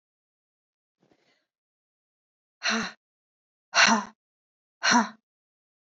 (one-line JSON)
{"exhalation_length": "5.9 s", "exhalation_amplitude": 16570, "exhalation_signal_mean_std_ratio": 0.27, "survey_phase": "beta (2021-08-13 to 2022-03-07)", "age": "18-44", "gender": "Male", "wearing_mask": "No", "symptom_cough_any": true, "symptom_sore_throat": true, "symptom_headache": true, "symptom_onset": "8 days", "smoker_status": "Never smoked", "respiratory_condition_asthma": false, "respiratory_condition_other": false, "recruitment_source": "REACT", "submission_delay": "16 days", "covid_test_result": "Negative", "covid_test_method": "RT-qPCR", "influenza_a_test_result": "Negative", "influenza_b_test_result": "Negative"}